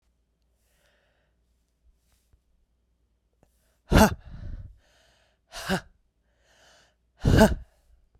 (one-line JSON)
{"exhalation_length": "8.2 s", "exhalation_amplitude": 24061, "exhalation_signal_mean_std_ratio": 0.23, "survey_phase": "beta (2021-08-13 to 2022-03-07)", "age": "45-64", "gender": "Female", "wearing_mask": "No", "symptom_runny_or_blocked_nose": true, "symptom_sore_throat": true, "symptom_fatigue": true, "smoker_status": "Never smoked", "respiratory_condition_asthma": true, "respiratory_condition_other": false, "recruitment_source": "Test and Trace", "submission_delay": "2 days", "covid_test_result": "Positive", "covid_test_method": "RT-qPCR", "covid_ct_value": 18.9, "covid_ct_gene": "ORF1ab gene", "covid_ct_mean": 19.5, "covid_viral_load": "390000 copies/ml", "covid_viral_load_category": "Low viral load (10K-1M copies/ml)"}